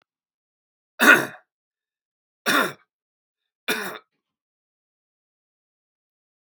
{"three_cough_length": "6.5 s", "three_cough_amplitude": 32768, "three_cough_signal_mean_std_ratio": 0.22, "survey_phase": "beta (2021-08-13 to 2022-03-07)", "age": "18-44", "gender": "Male", "wearing_mask": "No", "symptom_runny_or_blocked_nose": true, "symptom_shortness_of_breath": true, "symptom_sore_throat": true, "symptom_fatigue": true, "symptom_headache": true, "symptom_onset": "3 days", "smoker_status": "Never smoked", "respiratory_condition_asthma": false, "respiratory_condition_other": false, "recruitment_source": "Test and Trace", "submission_delay": "2 days", "covid_test_result": "Positive", "covid_test_method": "RT-qPCR", "covid_ct_value": 20.4, "covid_ct_gene": "ORF1ab gene"}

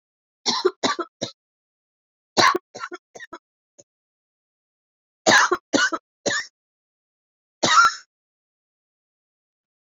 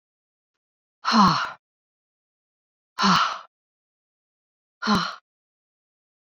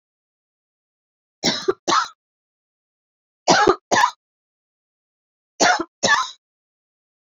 {"cough_length": "9.9 s", "cough_amplitude": 25966, "cough_signal_mean_std_ratio": 0.31, "exhalation_length": "6.2 s", "exhalation_amplitude": 18356, "exhalation_signal_mean_std_ratio": 0.32, "three_cough_length": "7.3 s", "three_cough_amplitude": 28394, "three_cough_signal_mean_std_ratio": 0.33, "survey_phase": "beta (2021-08-13 to 2022-03-07)", "age": "45-64", "gender": "Female", "wearing_mask": "No", "symptom_cough_any": true, "symptom_runny_or_blocked_nose": true, "symptom_diarrhoea": true, "symptom_fatigue": true, "symptom_headache": true, "symptom_onset": "2 days", "smoker_status": "Never smoked", "respiratory_condition_asthma": false, "respiratory_condition_other": false, "recruitment_source": "Test and Trace", "submission_delay": "2 days", "covid_test_result": "Positive", "covid_test_method": "RT-qPCR"}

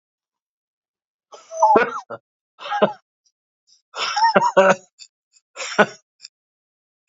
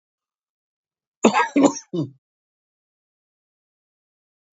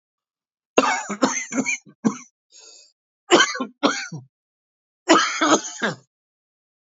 {"exhalation_length": "7.1 s", "exhalation_amplitude": 29264, "exhalation_signal_mean_std_ratio": 0.35, "cough_length": "4.5 s", "cough_amplitude": 28229, "cough_signal_mean_std_ratio": 0.25, "three_cough_length": "6.9 s", "three_cough_amplitude": 28282, "three_cough_signal_mean_std_ratio": 0.4, "survey_phase": "beta (2021-08-13 to 2022-03-07)", "age": "45-64", "gender": "Male", "wearing_mask": "No", "symptom_cough_any": true, "symptom_new_continuous_cough": true, "symptom_runny_or_blocked_nose": true, "symptom_shortness_of_breath": true, "symptom_sore_throat": true, "symptom_fatigue": true, "symptom_fever_high_temperature": true, "symptom_headache": true, "symptom_change_to_sense_of_smell_or_taste": true, "symptom_onset": "4 days", "smoker_status": "Ex-smoker", "respiratory_condition_asthma": false, "respiratory_condition_other": true, "recruitment_source": "Test and Trace", "submission_delay": "1 day", "covid_test_result": "Positive", "covid_test_method": "RT-qPCR", "covid_ct_value": 19.3, "covid_ct_gene": "ORF1ab gene", "covid_ct_mean": 19.6, "covid_viral_load": "360000 copies/ml", "covid_viral_load_category": "Low viral load (10K-1M copies/ml)"}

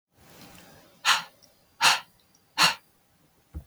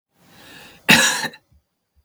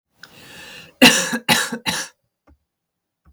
{"exhalation_length": "3.7 s", "exhalation_amplitude": 17186, "exhalation_signal_mean_std_ratio": 0.31, "cough_length": "2.0 s", "cough_amplitude": 32768, "cough_signal_mean_std_ratio": 0.33, "three_cough_length": "3.3 s", "three_cough_amplitude": 32768, "three_cough_signal_mean_std_ratio": 0.34, "survey_phase": "beta (2021-08-13 to 2022-03-07)", "age": "45-64", "gender": "Female", "wearing_mask": "No", "symptom_none": true, "smoker_status": "Never smoked", "respiratory_condition_asthma": false, "respiratory_condition_other": false, "recruitment_source": "Test and Trace", "submission_delay": "1 day", "covid_test_result": "Negative", "covid_test_method": "RT-qPCR"}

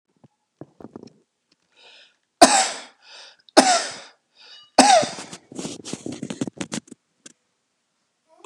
{"three_cough_length": "8.5 s", "three_cough_amplitude": 32768, "three_cough_signal_mean_std_ratio": 0.28, "survey_phase": "beta (2021-08-13 to 2022-03-07)", "age": "65+", "gender": "Male", "wearing_mask": "No", "symptom_runny_or_blocked_nose": true, "smoker_status": "Ex-smoker", "respiratory_condition_asthma": false, "respiratory_condition_other": true, "recruitment_source": "REACT", "submission_delay": "3 days", "covid_test_result": "Negative", "covid_test_method": "RT-qPCR", "influenza_a_test_result": "Negative", "influenza_b_test_result": "Negative"}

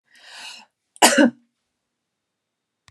{"cough_length": "2.9 s", "cough_amplitude": 32691, "cough_signal_mean_std_ratio": 0.25, "survey_phase": "beta (2021-08-13 to 2022-03-07)", "age": "45-64", "gender": "Female", "wearing_mask": "No", "symptom_none": true, "smoker_status": "Never smoked", "respiratory_condition_asthma": false, "respiratory_condition_other": false, "recruitment_source": "REACT", "submission_delay": "2 days", "covid_test_result": "Negative", "covid_test_method": "RT-qPCR"}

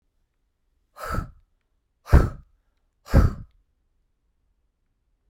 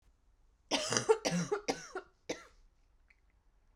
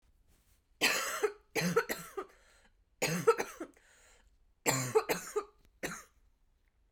{"exhalation_length": "5.3 s", "exhalation_amplitude": 29044, "exhalation_signal_mean_std_ratio": 0.23, "cough_length": "3.8 s", "cough_amplitude": 11271, "cough_signal_mean_std_ratio": 0.38, "three_cough_length": "6.9 s", "three_cough_amplitude": 7038, "three_cough_signal_mean_std_ratio": 0.41, "survey_phase": "beta (2021-08-13 to 2022-03-07)", "age": "18-44", "gender": "Female", "wearing_mask": "No", "symptom_cough_any": true, "symptom_new_continuous_cough": true, "symptom_sore_throat": true, "symptom_abdominal_pain": true, "symptom_fever_high_temperature": true, "symptom_onset": "3 days", "smoker_status": "Never smoked", "respiratory_condition_asthma": false, "respiratory_condition_other": false, "recruitment_source": "Test and Trace", "submission_delay": "2 days", "covid_test_result": "Positive", "covid_test_method": "ePCR"}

